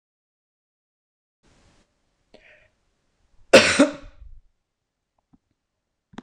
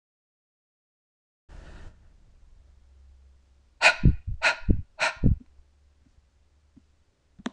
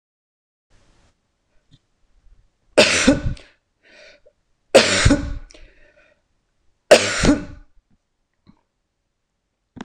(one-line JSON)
{"cough_length": "6.2 s", "cough_amplitude": 26028, "cough_signal_mean_std_ratio": 0.18, "exhalation_length": "7.5 s", "exhalation_amplitude": 21043, "exhalation_signal_mean_std_ratio": 0.28, "three_cough_length": "9.8 s", "three_cough_amplitude": 26028, "three_cough_signal_mean_std_ratio": 0.29, "survey_phase": "beta (2021-08-13 to 2022-03-07)", "age": "45-64", "gender": "Female", "wearing_mask": "No", "symptom_none": true, "smoker_status": "Ex-smoker", "respiratory_condition_asthma": false, "respiratory_condition_other": false, "recruitment_source": "REACT", "submission_delay": "15 days", "covid_test_result": "Negative", "covid_test_method": "RT-qPCR"}